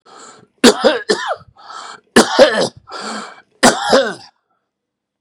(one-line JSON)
{"three_cough_length": "5.2 s", "three_cough_amplitude": 32768, "three_cough_signal_mean_std_ratio": 0.42, "survey_phase": "beta (2021-08-13 to 2022-03-07)", "age": "65+", "gender": "Male", "wearing_mask": "No", "symptom_cough_any": true, "symptom_runny_or_blocked_nose": true, "symptom_diarrhoea": true, "symptom_fatigue": true, "symptom_fever_high_temperature": true, "symptom_headache": true, "symptom_onset": "3 days", "smoker_status": "Never smoked", "respiratory_condition_asthma": false, "respiratory_condition_other": false, "recruitment_source": "Test and Trace", "submission_delay": "2 days", "covid_test_result": "Positive", "covid_test_method": "RT-qPCR", "covid_ct_value": 15.6, "covid_ct_gene": "ORF1ab gene", "covid_ct_mean": 16.2, "covid_viral_load": "5000000 copies/ml", "covid_viral_load_category": "High viral load (>1M copies/ml)"}